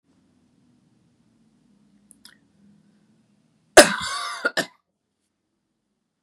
{
  "cough_length": "6.2 s",
  "cough_amplitude": 32768,
  "cough_signal_mean_std_ratio": 0.17,
  "survey_phase": "beta (2021-08-13 to 2022-03-07)",
  "age": "18-44",
  "gender": "Female",
  "wearing_mask": "No",
  "symptom_cough_any": true,
  "symptom_new_continuous_cough": true,
  "symptom_runny_or_blocked_nose": true,
  "symptom_sore_throat": true,
  "symptom_fatigue": true,
  "symptom_headache": true,
  "symptom_onset": "2 days",
  "smoker_status": "Never smoked",
  "respiratory_condition_asthma": false,
  "respiratory_condition_other": false,
  "recruitment_source": "Test and Trace",
  "submission_delay": "1 day",
  "covid_test_result": "Positive",
  "covid_test_method": "RT-qPCR",
  "covid_ct_value": 23.6,
  "covid_ct_gene": "ORF1ab gene",
  "covid_ct_mean": 23.9,
  "covid_viral_load": "14000 copies/ml",
  "covid_viral_load_category": "Low viral load (10K-1M copies/ml)"
}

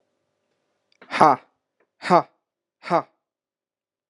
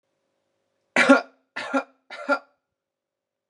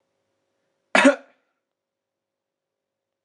{
  "exhalation_length": "4.1 s",
  "exhalation_amplitude": 32582,
  "exhalation_signal_mean_std_ratio": 0.23,
  "three_cough_length": "3.5 s",
  "three_cough_amplitude": 28939,
  "three_cough_signal_mean_std_ratio": 0.27,
  "cough_length": "3.2 s",
  "cough_amplitude": 27738,
  "cough_signal_mean_std_ratio": 0.19,
  "survey_phase": "beta (2021-08-13 to 2022-03-07)",
  "age": "18-44",
  "gender": "Male",
  "wearing_mask": "No",
  "symptom_cough_any": true,
  "symptom_onset": "2 days",
  "smoker_status": "Never smoked",
  "respiratory_condition_asthma": false,
  "respiratory_condition_other": false,
  "recruitment_source": "Test and Trace",
  "submission_delay": "2 days",
  "covid_test_result": "Positive",
  "covid_test_method": "RT-qPCR",
  "covid_ct_value": 26.0,
  "covid_ct_gene": "N gene"
}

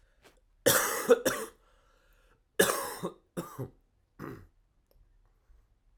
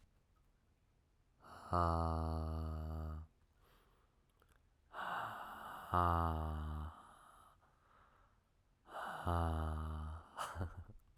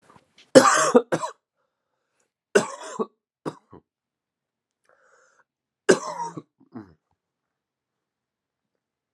{
  "cough_length": "6.0 s",
  "cough_amplitude": 11236,
  "cough_signal_mean_std_ratio": 0.33,
  "exhalation_length": "11.2 s",
  "exhalation_amplitude": 2999,
  "exhalation_signal_mean_std_ratio": 0.59,
  "three_cough_length": "9.1 s",
  "three_cough_amplitude": 32767,
  "three_cough_signal_mean_std_ratio": 0.22,
  "survey_phase": "alpha (2021-03-01 to 2021-08-12)",
  "age": "18-44",
  "gender": "Male",
  "wearing_mask": "No",
  "symptom_cough_any": true,
  "symptom_new_continuous_cough": true,
  "symptom_fatigue": true,
  "symptom_fever_high_temperature": true,
  "symptom_headache": true,
  "symptom_change_to_sense_of_smell_or_taste": true,
  "symptom_loss_of_taste": true,
  "smoker_status": "Never smoked",
  "respiratory_condition_asthma": false,
  "respiratory_condition_other": false,
  "recruitment_source": "Test and Trace",
  "submission_delay": "1 day",
  "covid_test_result": "Positive",
  "covid_test_method": "LFT"
}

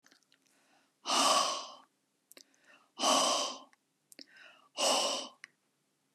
{
  "exhalation_length": "6.1 s",
  "exhalation_amplitude": 5841,
  "exhalation_signal_mean_std_ratio": 0.43,
  "survey_phase": "beta (2021-08-13 to 2022-03-07)",
  "age": "65+",
  "gender": "Male",
  "wearing_mask": "No",
  "symptom_none": true,
  "smoker_status": "Ex-smoker",
  "respiratory_condition_asthma": false,
  "respiratory_condition_other": false,
  "recruitment_source": "REACT",
  "submission_delay": "2 days",
  "covid_test_result": "Negative",
  "covid_test_method": "RT-qPCR"
}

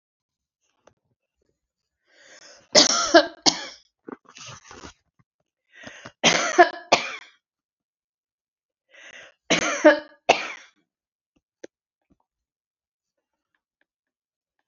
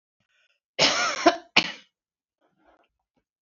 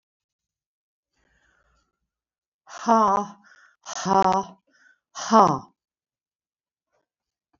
{
  "three_cough_length": "14.7 s",
  "three_cough_amplitude": 31940,
  "three_cough_signal_mean_std_ratio": 0.24,
  "cough_length": "3.4 s",
  "cough_amplitude": 24870,
  "cough_signal_mean_std_ratio": 0.3,
  "exhalation_length": "7.6 s",
  "exhalation_amplitude": 26739,
  "exhalation_signal_mean_std_ratio": 0.28,
  "survey_phase": "beta (2021-08-13 to 2022-03-07)",
  "age": "65+",
  "gender": "Female",
  "wearing_mask": "No",
  "symptom_none": true,
  "smoker_status": "Never smoked",
  "respiratory_condition_asthma": false,
  "respiratory_condition_other": false,
  "recruitment_source": "REACT",
  "submission_delay": "3 days",
  "covid_test_result": "Negative",
  "covid_test_method": "RT-qPCR"
}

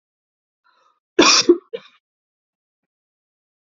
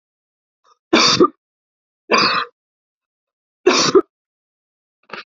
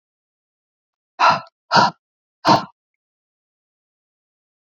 {
  "cough_length": "3.7 s",
  "cough_amplitude": 32768,
  "cough_signal_mean_std_ratio": 0.24,
  "three_cough_length": "5.4 s",
  "three_cough_amplitude": 32768,
  "three_cough_signal_mean_std_ratio": 0.34,
  "exhalation_length": "4.7 s",
  "exhalation_amplitude": 28387,
  "exhalation_signal_mean_std_ratio": 0.26,
  "survey_phase": "beta (2021-08-13 to 2022-03-07)",
  "age": "18-44",
  "gender": "Female",
  "wearing_mask": "No",
  "symptom_none": true,
  "smoker_status": "Never smoked",
  "respiratory_condition_asthma": false,
  "respiratory_condition_other": false,
  "recruitment_source": "Test and Trace",
  "submission_delay": "7 days",
  "covid_test_result": "Negative",
  "covid_test_method": "LFT"
}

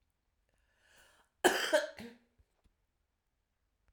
{
  "three_cough_length": "3.9 s",
  "three_cough_amplitude": 8907,
  "three_cough_signal_mean_std_ratio": 0.24,
  "survey_phase": "alpha (2021-03-01 to 2021-08-12)",
  "age": "45-64",
  "gender": "Female",
  "wearing_mask": "No",
  "symptom_none": true,
  "smoker_status": "Prefer not to say",
  "respiratory_condition_asthma": true,
  "respiratory_condition_other": false,
  "recruitment_source": "Test and Trace",
  "submission_delay": "2 days",
  "covid_test_result": "Positive",
  "covid_test_method": "RT-qPCR",
  "covid_ct_value": 12.7,
  "covid_ct_gene": "ORF1ab gene",
  "covid_ct_mean": 13.3,
  "covid_viral_load": "42000000 copies/ml",
  "covid_viral_load_category": "High viral load (>1M copies/ml)"
}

